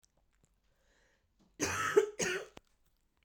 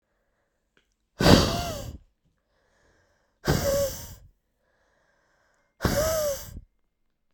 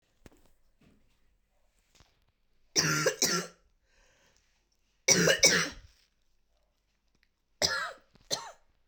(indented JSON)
{
  "cough_length": "3.2 s",
  "cough_amplitude": 7090,
  "cough_signal_mean_std_ratio": 0.34,
  "exhalation_length": "7.3 s",
  "exhalation_amplitude": 32768,
  "exhalation_signal_mean_std_ratio": 0.36,
  "three_cough_length": "8.9 s",
  "three_cough_amplitude": 15484,
  "three_cough_signal_mean_std_ratio": 0.32,
  "survey_phase": "beta (2021-08-13 to 2022-03-07)",
  "age": "18-44",
  "gender": "Female",
  "wearing_mask": "No",
  "symptom_cough_any": true,
  "symptom_runny_or_blocked_nose": true,
  "symptom_shortness_of_breath": true,
  "symptom_sore_throat": true,
  "symptom_diarrhoea": true,
  "symptom_fatigue": true,
  "symptom_fever_high_temperature": true,
  "symptom_headache": true,
  "symptom_change_to_sense_of_smell_or_taste": true,
  "symptom_loss_of_taste": true,
  "symptom_onset": "3 days",
  "smoker_status": "Never smoked",
  "respiratory_condition_asthma": true,
  "respiratory_condition_other": false,
  "recruitment_source": "Test and Trace",
  "submission_delay": "2 days",
  "covid_test_result": "Positive",
  "covid_test_method": "RT-qPCR"
}